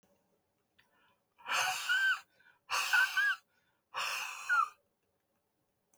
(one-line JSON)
{"exhalation_length": "6.0 s", "exhalation_amplitude": 4734, "exhalation_signal_mean_std_ratio": 0.48, "survey_phase": "beta (2021-08-13 to 2022-03-07)", "age": "65+", "gender": "Male", "wearing_mask": "No", "symptom_none": true, "smoker_status": "Ex-smoker", "respiratory_condition_asthma": false, "respiratory_condition_other": false, "recruitment_source": "REACT", "submission_delay": "1 day", "covid_test_result": "Negative", "covid_test_method": "RT-qPCR", "influenza_a_test_result": "Negative", "influenza_b_test_result": "Negative"}